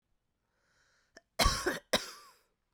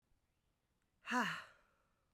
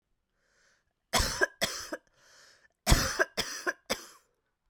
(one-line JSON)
{"cough_length": "2.7 s", "cough_amplitude": 7676, "cough_signal_mean_std_ratio": 0.31, "exhalation_length": "2.1 s", "exhalation_amplitude": 1624, "exhalation_signal_mean_std_ratio": 0.32, "three_cough_length": "4.7 s", "three_cough_amplitude": 15863, "three_cough_signal_mean_std_ratio": 0.36, "survey_phase": "beta (2021-08-13 to 2022-03-07)", "age": "18-44", "gender": "Female", "wearing_mask": "No", "symptom_new_continuous_cough": true, "symptom_runny_or_blocked_nose": true, "symptom_shortness_of_breath": true, "symptom_fatigue": true, "symptom_headache": true, "symptom_onset": "2 days", "smoker_status": "Never smoked", "respiratory_condition_asthma": false, "respiratory_condition_other": false, "recruitment_source": "Test and Trace", "submission_delay": "1 day", "covid_test_result": "Positive", "covid_test_method": "RT-qPCR", "covid_ct_value": 18.4, "covid_ct_gene": "ORF1ab gene", "covid_ct_mean": 18.9, "covid_viral_load": "660000 copies/ml", "covid_viral_load_category": "Low viral load (10K-1M copies/ml)"}